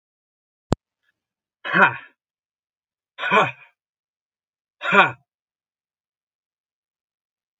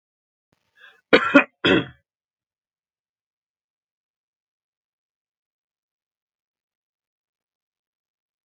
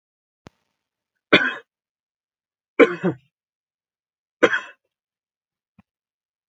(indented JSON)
{
  "exhalation_length": "7.6 s",
  "exhalation_amplitude": 32767,
  "exhalation_signal_mean_std_ratio": 0.24,
  "cough_length": "8.4 s",
  "cough_amplitude": 32766,
  "cough_signal_mean_std_ratio": 0.16,
  "three_cough_length": "6.5 s",
  "three_cough_amplitude": 32767,
  "three_cough_signal_mean_std_ratio": 0.2,
  "survey_phase": "beta (2021-08-13 to 2022-03-07)",
  "age": "45-64",
  "gender": "Male",
  "wearing_mask": "No",
  "symptom_none": true,
  "smoker_status": "Never smoked",
  "respiratory_condition_asthma": false,
  "respiratory_condition_other": false,
  "recruitment_source": "Test and Trace",
  "submission_delay": "2 days",
  "covid_test_result": "Negative",
  "covid_test_method": "RT-qPCR"
}